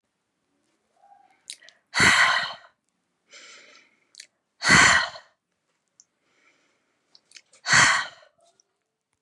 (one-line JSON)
{"exhalation_length": "9.2 s", "exhalation_amplitude": 23257, "exhalation_signal_mean_std_ratio": 0.31, "survey_phase": "beta (2021-08-13 to 2022-03-07)", "age": "18-44", "gender": "Female", "wearing_mask": "No", "symptom_none": true, "smoker_status": "Never smoked", "respiratory_condition_asthma": false, "respiratory_condition_other": false, "recruitment_source": "REACT", "submission_delay": "1 day", "covid_test_result": "Negative", "covid_test_method": "RT-qPCR", "influenza_a_test_result": "Negative", "influenza_b_test_result": "Negative"}